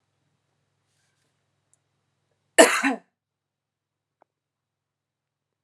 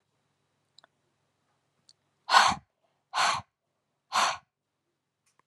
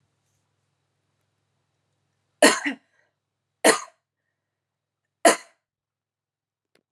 {"cough_length": "5.6 s", "cough_amplitude": 32767, "cough_signal_mean_std_ratio": 0.16, "exhalation_length": "5.5 s", "exhalation_amplitude": 17555, "exhalation_signal_mean_std_ratio": 0.27, "three_cough_length": "6.9 s", "three_cough_amplitude": 28310, "three_cough_signal_mean_std_ratio": 0.19, "survey_phase": "beta (2021-08-13 to 2022-03-07)", "age": "18-44", "gender": "Female", "wearing_mask": "No", "symptom_headache": true, "symptom_change_to_sense_of_smell_or_taste": true, "symptom_loss_of_taste": true, "symptom_other": true, "smoker_status": "Ex-smoker", "respiratory_condition_asthma": false, "respiratory_condition_other": false, "recruitment_source": "Test and Trace", "submission_delay": "1 day", "covid_test_result": "Positive", "covid_test_method": "RT-qPCR", "covid_ct_value": 28.0, "covid_ct_gene": "ORF1ab gene", "covid_ct_mean": 28.7, "covid_viral_load": "380 copies/ml", "covid_viral_load_category": "Minimal viral load (< 10K copies/ml)"}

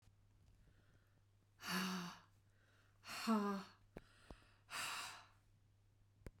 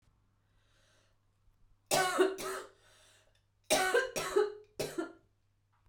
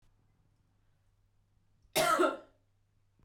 {"exhalation_length": "6.4 s", "exhalation_amplitude": 1165, "exhalation_signal_mean_std_ratio": 0.43, "three_cough_length": "5.9 s", "three_cough_amplitude": 5500, "three_cough_signal_mean_std_ratio": 0.41, "cough_length": "3.2 s", "cough_amplitude": 4936, "cough_signal_mean_std_ratio": 0.3, "survey_phase": "beta (2021-08-13 to 2022-03-07)", "age": "45-64", "gender": "Female", "wearing_mask": "Yes", "symptom_cough_any": true, "symptom_runny_or_blocked_nose": true, "symptom_fatigue": true, "symptom_headache": true, "symptom_other": true, "symptom_onset": "5 days", "smoker_status": "Never smoked", "respiratory_condition_asthma": false, "respiratory_condition_other": false, "recruitment_source": "Test and Trace", "submission_delay": "2 days", "covid_test_result": "Positive", "covid_test_method": "ePCR"}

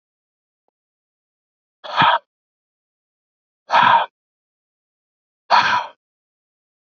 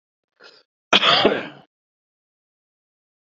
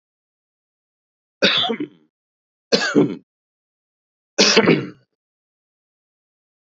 {"exhalation_length": "7.0 s", "exhalation_amplitude": 32767, "exhalation_signal_mean_std_ratio": 0.29, "cough_length": "3.2 s", "cough_amplitude": 29295, "cough_signal_mean_std_ratio": 0.3, "three_cough_length": "6.7 s", "three_cough_amplitude": 27574, "three_cough_signal_mean_std_ratio": 0.33, "survey_phase": "beta (2021-08-13 to 2022-03-07)", "age": "18-44", "gender": "Male", "wearing_mask": "No", "symptom_cough_any": true, "symptom_runny_or_blocked_nose": true, "symptom_sore_throat": true, "smoker_status": "Ex-smoker", "respiratory_condition_asthma": false, "respiratory_condition_other": false, "recruitment_source": "REACT", "submission_delay": "3 days", "covid_test_result": "Negative", "covid_test_method": "RT-qPCR", "influenza_a_test_result": "Negative", "influenza_b_test_result": "Negative"}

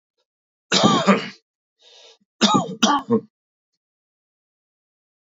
{"three_cough_length": "5.4 s", "three_cough_amplitude": 26685, "three_cough_signal_mean_std_ratio": 0.35, "survey_phase": "beta (2021-08-13 to 2022-03-07)", "age": "45-64", "gender": "Male", "wearing_mask": "No", "symptom_none": true, "smoker_status": "Never smoked", "respiratory_condition_asthma": false, "respiratory_condition_other": false, "recruitment_source": "REACT", "submission_delay": "2 days", "covid_test_result": "Negative", "covid_test_method": "RT-qPCR", "influenza_a_test_result": "Negative", "influenza_b_test_result": "Negative"}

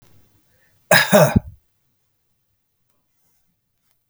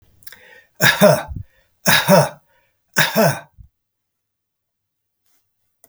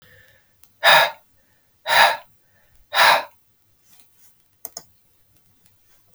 {"cough_length": "4.1 s", "cough_amplitude": 32768, "cough_signal_mean_std_ratio": 0.25, "three_cough_length": "5.9 s", "three_cough_amplitude": 32768, "three_cough_signal_mean_std_ratio": 0.35, "exhalation_length": "6.1 s", "exhalation_amplitude": 32768, "exhalation_signal_mean_std_ratio": 0.3, "survey_phase": "beta (2021-08-13 to 2022-03-07)", "age": "65+", "gender": "Male", "wearing_mask": "No", "symptom_runny_or_blocked_nose": true, "smoker_status": "Ex-smoker", "respiratory_condition_asthma": false, "respiratory_condition_other": false, "recruitment_source": "REACT", "submission_delay": "1 day", "covid_test_result": "Negative", "covid_test_method": "RT-qPCR", "influenza_a_test_result": "Negative", "influenza_b_test_result": "Negative"}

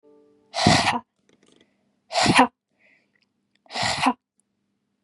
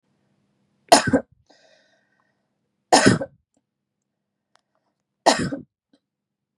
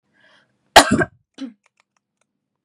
{"exhalation_length": "5.0 s", "exhalation_amplitude": 28691, "exhalation_signal_mean_std_ratio": 0.36, "three_cough_length": "6.6 s", "three_cough_amplitude": 32768, "three_cough_signal_mean_std_ratio": 0.24, "cough_length": "2.6 s", "cough_amplitude": 32768, "cough_signal_mean_std_ratio": 0.22, "survey_phase": "beta (2021-08-13 to 2022-03-07)", "age": "18-44", "gender": "Female", "wearing_mask": "No", "symptom_none": true, "smoker_status": "Never smoked", "respiratory_condition_asthma": false, "respiratory_condition_other": false, "recruitment_source": "REACT", "submission_delay": "2 days", "covid_test_result": "Negative", "covid_test_method": "RT-qPCR", "influenza_a_test_result": "Negative", "influenza_b_test_result": "Negative"}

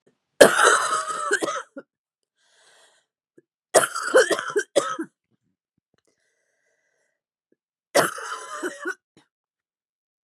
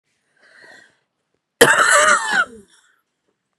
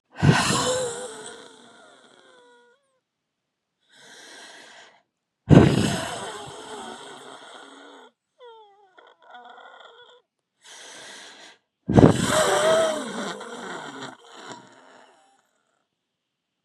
{"three_cough_length": "10.2 s", "three_cough_amplitude": 32768, "three_cough_signal_mean_std_ratio": 0.33, "cough_length": "3.6 s", "cough_amplitude": 32768, "cough_signal_mean_std_ratio": 0.39, "exhalation_length": "16.6 s", "exhalation_amplitude": 32768, "exhalation_signal_mean_std_ratio": 0.33, "survey_phase": "beta (2021-08-13 to 2022-03-07)", "age": "45-64", "gender": "Female", "wearing_mask": "No", "symptom_cough_any": true, "symptom_runny_or_blocked_nose": true, "symptom_shortness_of_breath": true, "symptom_fatigue": true, "symptom_change_to_sense_of_smell_or_taste": true, "symptom_loss_of_taste": true, "symptom_other": true, "symptom_onset": "7 days", "smoker_status": "Ex-smoker", "respiratory_condition_asthma": true, "respiratory_condition_other": false, "recruitment_source": "Test and Trace", "submission_delay": "3 days", "covid_test_result": "Negative", "covid_test_method": "RT-qPCR"}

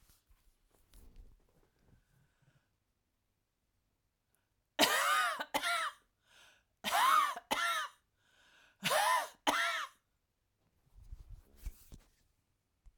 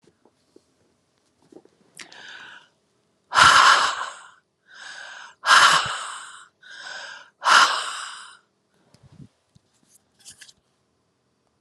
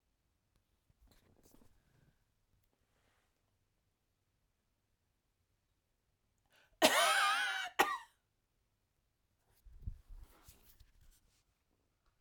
{"three_cough_length": "13.0 s", "three_cough_amplitude": 7416, "three_cough_signal_mean_std_ratio": 0.39, "exhalation_length": "11.6 s", "exhalation_amplitude": 31352, "exhalation_signal_mean_std_ratio": 0.32, "cough_length": "12.2 s", "cough_amplitude": 7116, "cough_signal_mean_std_ratio": 0.24, "survey_phase": "alpha (2021-03-01 to 2021-08-12)", "age": "45-64", "gender": "Female", "wearing_mask": "No", "symptom_none": true, "smoker_status": "Ex-smoker", "respiratory_condition_asthma": false, "respiratory_condition_other": false, "recruitment_source": "REACT", "submission_delay": "1 day", "covid_test_result": "Negative", "covid_test_method": "RT-qPCR"}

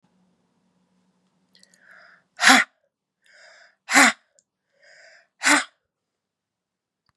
{"exhalation_length": "7.2 s", "exhalation_amplitude": 32083, "exhalation_signal_mean_std_ratio": 0.23, "survey_phase": "beta (2021-08-13 to 2022-03-07)", "age": "65+", "gender": "Female", "wearing_mask": "No", "symptom_cough_any": true, "symptom_runny_or_blocked_nose": true, "smoker_status": "Never smoked", "respiratory_condition_asthma": false, "respiratory_condition_other": false, "recruitment_source": "REACT", "submission_delay": "0 days", "covid_test_result": "Positive", "covid_test_method": "RT-qPCR", "covid_ct_value": 22.4, "covid_ct_gene": "E gene", "influenza_a_test_result": "Negative", "influenza_b_test_result": "Negative"}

